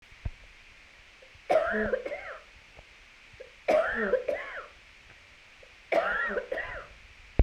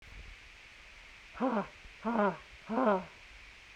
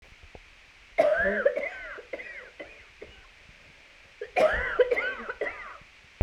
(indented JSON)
{
  "three_cough_length": "7.4 s",
  "three_cough_amplitude": 17247,
  "three_cough_signal_mean_std_ratio": 0.48,
  "exhalation_length": "3.8 s",
  "exhalation_amplitude": 14226,
  "exhalation_signal_mean_std_ratio": 0.48,
  "cough_length": "6.2 s",
  "cough_amplitude": 11296,
  "cough_signal_mean_std_ratio": 0.47,
  "survey_phase": "beta (2021-08-13 to 2022-03-07)",
  "age": "45-64",
  "gender": "Female",
  "wearing_mask": "No",
  "symptom_cough_any": true,
  "symptom_shortness_of_breath": true,
  "symptom_fatigue": true,
  "symptom_onset": "5 days",
  "smoker_status": "Ex-smoker",
  "respiratory_condition_asthma": false,
  "respiratory_condition_other": false,
  "recruitment_source": "Test and Trace",
  "submission_delay": "1 day",
  "covid_test_result": "Positive",
  "covid_test_method": "ePCR"
}